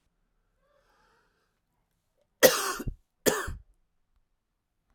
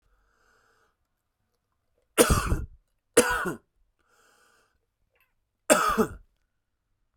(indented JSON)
{
  "cough_length": "4.9 s",
  "cough_amplitude": 23205,
  "cough_signal_mean_std_ratio": 0.23,
  "three_cough_length": "7.2 s",
  "three_cough_amplitude": 24272,
  "three_cough_signal_mean_std_ratio": 0.29,
  "survey_phase": "alpha (2021-03-01 to 2021-08-12)",
  "age": "45-64",
  "gender": "Male",
  "wearing_mask": "No",
  "symptom_cough_any": true,
  "symptom_fatigue": true,
  "symptom_headache": true,
  "symptom_change_to_sense_of_smell_or_taste": true,
  "symptom_onset": "2 days",
  "smoker_status": "Current smoker (1 to 10 cigarettes per day)",
  "respiratory_condition_asthma": false,
  "respiratory_condition_other": false,
  "recruitment_source": "Test and Trace",
  "submission_delay": "1 day",
  "covid_test_result": "Positive",
  "covid_test_method": "RT-qPCR",
  "covid_ct_value": 14.6,
  "covid_ct_gene": "ORF1ab gene",
  "covid_ct_mean": 14.7,
  "covid_viral_load": "15000000 copies/ml",
  "covid_viral_load_category": "High viral load (>1M copies/ml)"
}